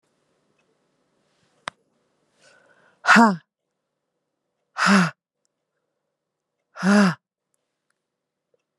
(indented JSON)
{
  "exhalation_length": "8.8 s",
  "exhalation_amplitude": 28308,
  "exhalation_signal_mean_std_ratio": 0.25,
  "survey_phase": "beta (2021-08-13 to 2022-03-07)",
  "age": "18-44",
  "gender": "Female",
  "wearing_mask": "No",
  "symptom_cough_any": true,
  "symptom_runny_or_blocked_nose": true,
  "symptom_onset": "7 days",
  "smoker_status": "Ex-smoker",
  "respiratory_condition_asthma": false,
  "respiratory_condition_other": false,
  "recruitment_source": "REACT",
  "submission_delay": "1 day",
  "covid_test_result": "Negative",
  "covid_test_method": "RT-qPCR",
  "influenza_a_test_result": "Negative",
  "influenza_b_test_result": "Negative"
}